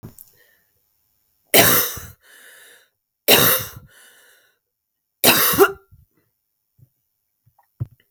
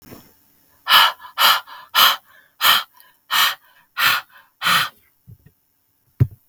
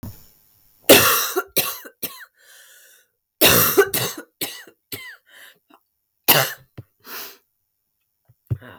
{"three_cough_length": "8.1 s", "three_cough_amplitude": 32768, "three_cough_signal_mean_std_ratio": 0.31, "exhalation_length": "6.5 s", "exhalation_amplitude": 32768, "exhalation_signal_mean_std_ratio": 0.41, "cough_length": "8.8 s", "cough_amplitude": 32768, "cough_signal_mean_std_ratio": 0.34, "survey_phase": "alpha (2021-03-01 to 2021-08-12)", "age": "18-44", "gender": "Female", "wearing_mask": "No", "symptom_cough_any": true, "symptom_fatigue": true, "symptom_fever_high_temperature": true, "symptom_headache": true, "symptom_onset": "2 days", "smoker_status": "Ex-smoker", "respiratory_condition_asthma": false, "respiratory_condition_other": false, "recruitment_source": "Test and Trace", "submission_delay": "1 day", "covid_test_result": "Positive", "covid_test_method": "RT-qPCR", "covid_ct_value": 24.9, "covid_ct_gene": "ORF1ab gene"}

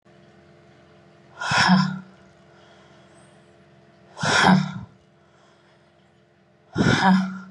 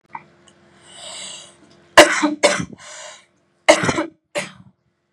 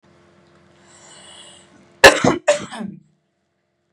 {"exhalation_length": "7.5 s", "exhalation_amplitude": 24334, "exhalation_signal_mean_std_ratio": 0.4, "three_cough_length": "5.1 s", "three_cough_amplitude": 32768, "three_cough_signal_mean_std_ratio": 0.31, "cough_length": "3.9 s", "cough_amplitude": 32768, "cough_signal_mean_std_ratio": 0.25, "survey_phase": "beta (2021-08-13 to 2022-03-07)", "age": "18-44", "gender": "Female", "wearing_mask": "No", "symptom_none": true, "smoker_status": "Never smoked", "respiratory_condition_asthma": false, "respiratory_condition_other": false, "recruitment_source": "REACT", "submission_delay": "1 day", "covid_test_result": "Negative", "covid_test_method": "RT-qPCR", "influenza_a_test_result": "Negative", "influenza_b_test_result": "Negative"}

